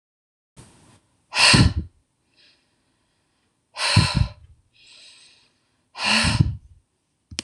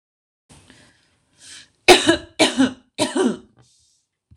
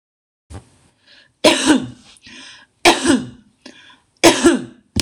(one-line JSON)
{"exhalation_length": "7.4 s", "exhalation_amplitude": 25918, "exhalation_signal_mean_std_ratio": 0.34, "cough_length": "4.4 s", "cough_amplitude": 26028, "cough_signal_mean_std_ratio": 0.33, "three_cough_length": "5.0 s", "three_cough_amplitude": 26028, "three_cough_signal_mean_std_ratio": 0.38, "survey_phase": "beta (2021-08-13 to 2022-03-07)", "age": "18-44", "gender": "Female", "wearing_mask": "No", "symptom_none": true, "smoker_status": "Current smoker (1 to 10 cigarettes per day)", "respiratory_condition_asthma": false, "respiratory_condition_other": false, "recruitment_source": "REACT", "submission_delay": "1 day", "covid_test_result": "Negative", "covid_test_method": "RT-qPCR"}